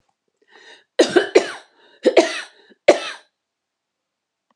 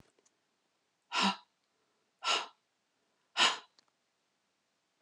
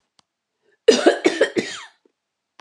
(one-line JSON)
{"three_cough_length": "4.6 s", "three_cough_amplitude": 32768, "three_cough_signal_mean_std_ratio": 0.29, "exhalation_length": "5.0 s", "exhalation_amplitude": 8257, "exhalation_signal_mean_std_ratio": 0.27, "cough_length": "2.6 s", "cough_amplitude": 32603, "cough_signal_mean_std_ratio": 0.34, "survey_phase": "alpha (2021-03-01 to 2021-08-12)", "age": "45-64", "gender": "Female", "wearing_mask": "No", "symptom_cough_any": true, "smoker_status": "Never smoked", "respiratory_condition_asthma": false, "respiratory_condition_other": false, "recruitment_source": "REACT", "submission_delay": "1 day", "covid_test_result": "Negative", "covid_test_method": "RT-qPCR"}